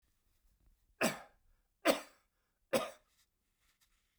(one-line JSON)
{"three_cough_length": "4.2 s", "three_cough_amplitude": 6376, "three_cough_signal_mean_std_ratio": 0.25, "survey_phase": "beta (2021-08-13 to 2022-03-07)", "age": "65+", "gender": "Male", "wearing_mask": "No", "symptom_cough_any": true, "smoker_status": "Never smoked", "respiratory_condition_asthma": false, "respiratory_condition_other": false, "recruitment_source": "REACT", "submission_delay": "2 days", "covid_test_result": "Negative", "covid_test_method": "RT-qPCR", "influenza_a_test_result": "Negative", "influenza_b_test_result": "Negative"}